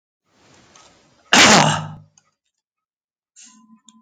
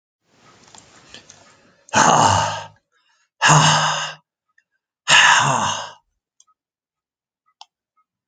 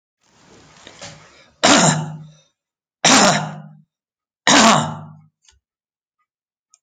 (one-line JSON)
{"cough_length": "4.0 s", "cough_amplitude": 32768, "cough_signal_mean_std_ratio": 0.29, "exhalation_length": "8.3 s", "exhalation_amplitude": 32767, "exhalation_signal_mean_std_ratio": 0.4, "three_cough_length": "6.8 s", "three_cough_amplitude": 32768, "three_cough_signal_mean_std_ratio": 0.37, "survey_phase": "alpha (2021-03-01 to 2021-08-12)", "age": "65+", "gender": "Male", "wearing_mask": "No", "symptom_none": true, "smoker_status": "Never smoked", "respiratory_condition_asthma": false, "respiratory_condition_other": false, "recruitment_source": "REACT", "submission_delay": "1 day", "covid_test_result": "Negative", "covid_test_method": "RT-qPCR"}